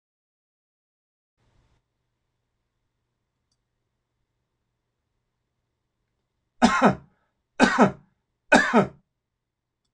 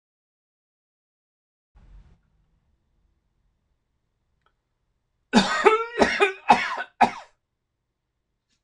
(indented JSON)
{
  "three_cough_length": "9.9 s",
  "three_cough_amplitude": 24369,
  "three_cough_signal_mean_std_ratio": 0.23,
  "cough_length": "8.6 s",
  "cough_amplitude": 26007,
  "cough_signal_mean_std_ratio": 0.27,
  "survey_phase": "beta (2021-08-13 to 2022-03-07)",
  "age": "45-64",
  "gender": "Male",
  "wearing_mask": "No",
  "symptom_none": true,
  "smoker_status": "Never smoked",
  "respiratory_condition_asthma": false,
  "respiratory_condition_other": false,
  "recruitment_source": "REACT",
  "submission_delay": "3 days",
  "covid_test_result": "Negative",
  "covid_test_method": "RT-qPCR",
  "influenza_a_test_result": "Negative",
  "influenza_b_test_result": "Negative"
}